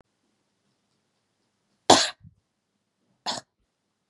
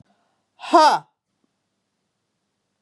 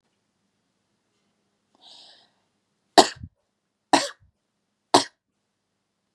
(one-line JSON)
{"cough_length": "4.1 s", "cough_amplitude": 32413, "cough_signal_mean_std_ratio": 0.17, "exhalation_length": "2.8 s", "exhalation_amplitude": 25132, "exhalation_signal_mean_std_ratio": 0.25, "three_cough_length": "6.1 s", "three_cough_amplitude": 32767, "three_cough_signal_mean_std_ratio": 0.15, "survey_phase": "beta (2021-08-13 to 2022-03-07)", "age": "45-64", "gender": "Female", "wearing_mask": "Yes", "symptom_none": true, "smoker_status": "Never smoked", "respiratory_condition_asthma": false, "respiratory_condition_other": false, "recruitment_source": "Test and Trace", "submission_delay": "2 days", "covid_test_result": "Positive", "covid_test_method": "RT-qPCR", "covid_ct_value": 27.5, "covid_ct_gene": "ORF1ab gene"}